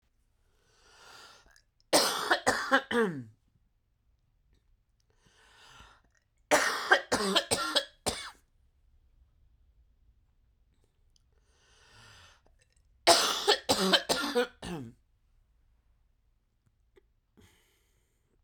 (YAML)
three_cough_length: 18.4 s
three_cough_amplitude: 16332
three_cough_signal_mean_std_ratio: 0.33
survey_phase: beta (2021-08-13 to 2022-03-07)
age: 18-44
gender: Female
wearing_mask: 'No'
symptom_cough_any: true
symptom_new_continuous_cough: true
symptom_runny_or_blocked_nose: true
symptom_shortness_of_breath: true
symptom_sore_throat: true
symptom_fatigue: true
symptom_fever_high_temperature: true
symptom_headache: true
smoker_status: Ex-smoker
respiratory_condition_asthma: false
respiratory_condition_other: false
recruitment_source: Test and Trace
submission_delay: 2 days
covid_test_result: Positive
covid_test_method: RT-qPCR
covid_ct_value: 22.4
covid_ct_gene: ORF1ab gene
covid_ct_mean: 23.5
covid_viral_load: 20000 copies/ml
covid_viral_load_category: Low viral load (10K-1M copies/ml)